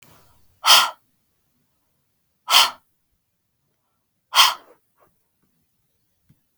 {"exhalation_length": "6.6 s", "exhalation_amplitude": 32768, "exhalation_signal_mean_std_ratio": 0.24, "survey_phase": "beta (2021-08-13 to 2022-03-07)", "age": "45-64", "gender": "Female", "wearing_mask": "No", "symptom_none": true, "smoker_status": "Ex-smoker", "respiratory_condition_asthma": false, "respiratory_condition_other": false, "recruitment_source": "REACT", "submission_delay": "1 day", "covid_test_result": "Negative", "covid_test_method": "RT-qPCR", "influenza_a_test_result": "Negative", "influenza_b_test_result": "Negative"}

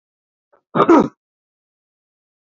{"cough_length": "2.5 s", "cough_amplitude": 30119, "cough_signal_mean_std_ratio": 0.27, "survey_phase": "beta (2021-08-13 to 2022-03-07)", "age": "65+", "gender": "Male", "wearing_mask": "No", "symptom_none": true, "smoker_status": "Ex-smoker", "respiratory_condition_asthma": false, "respiratory_condition_other": false, "recruitment_source": "REACT", "submission_delay": "1 day", "covid_test_result": "Negative", "covid_test_method": "RT-qPCR", "influenza_a_test_result": "Negative", "influenza_b_test_result": "Negative"}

